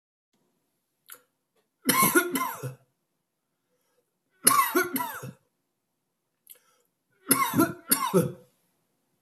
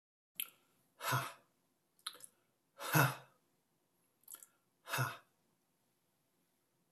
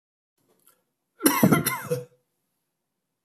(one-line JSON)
{"three_cough_length": "9.2 s", "three_cough_amplitude": 25157, "three_cough_signal_mean_std_ratio": 0.36, "exhalation_length": "6.9 s", "exhalation_amplitude": 4838, "exhalation_signal_mean_std_ratio": 0.27, "cough_length": "3.2 s", "cough_amplitude": 26912, "cough_signal_mean_std_ratio": 0.32, "survey_phase": "beta (2021-08-13 to 2022-03-07)", "age": "45-64", "gender": "Male", "wearing_mask": "No", "symptom_none": true, "smoker_status": "Never smoked", "respiratory_condition_asthma": false, "respiratory_condition_other": false, "recruitment_source": "REACT", "submission_delay": "3 days", "covid_test_result": "Negative", "covid_test_method": "RT-qPCR"}